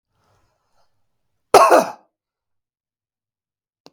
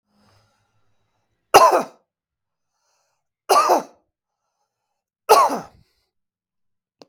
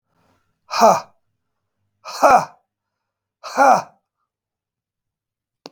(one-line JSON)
{"cough_length": "3.9 s", "cough_amplitude": 32768, "cough_signal_mean_std_ratio": 0.22, "three_cough_length": "7.1 s", "three_cough_amplitude": 32768, "three_cough_signal_mean_std_ratio": 0.27, "exhalation_length": "5.7 s", "exhalation_amplitude": 32768, "exhalation_signal_mean_std_ratio": 0.29, "survey_phase": "beta (2021-08-13 to 2022-03-07)", "age": "45-64", "gender": "Male", "wearing_mask": "No", "symptom_none": true, "smoker_status": "Never smoked", "respiratory_condition_asthma": false, "respiratory_condition_other": false, "recruitment_source": "REACT", "submission_delay": "1 day", "covid_test_result": "Negative", "covid_test_method": "RT-qPCR", "influenza_a_test_result": "Unknown/Void", "influenza_b_test_result": "Unknown/Void"}